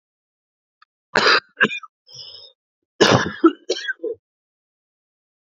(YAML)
cough_length: 5.5 s
cough_amplitude: 31203
cough_signal_mean_std_ratio: 0.32
survey_phase: beta (2021-08-13 to 2022-03-07)
age: 18-44
gender: Male
wearing_mask: 'No'
symptom_cough_any: true
symptom_change_to_sense_of_smell_or_taste: true
symptom_loss_of_taste: true
symptom_onset: 3 days
smoker_status: Never smoked
respiratory_condition_asthma: false
respiratory_condition_other: false
recruitment_source: Test and Trace
submission_delay: 2 days
covid_test_result: Positive
covid_test_method: RT-qPCR
covid_ct_value: 23.0
covid_ct_gene: S gene
covid_ct_mean: 23.1
covid_viral_load: 26000 copies/ml
covid_viral_load_category: Low viral load (10K-1M copies/ml)